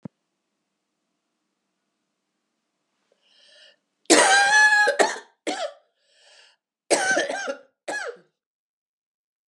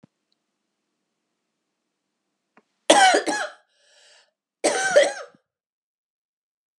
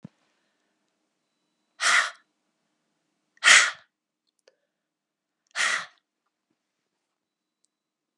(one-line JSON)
{"cough_length": "9.5 s", "cough_amplitude": 32083, "cough_signal_mean_std_ratio": 0.35, "three_cough_length": "6.8 s", "three_cough_amplitude": 31355, "three_cough_signal_mean_std_ratio": 0.28, "exhalation_length": "8.2 s", "exhalation_amplitude": 27262, "exhalation_signal_mean_std_ratio": 0.22, "survey_phase": "alpha (2021-03-01 to 2021-08-12)", "age": "45-64", "gender": "Female", "wearing_mask": "No", "symptom_cough_any": true, "symptom_new_continuous_cough": true, "symptom_headache": true, "symptom_onset": "7 days", "smoker_status": "Never smoked", "respiratory_condition_asthma": false, "respiratory_condition_other": false, "recruitment_source": "Test and Trace", "submission_delay": "3 days", "covid_test_result": "Positive", "covid_test_method": "RT-qPCR", "covid_ct_value": 27.1, "covid_ct_gene": "N gene"}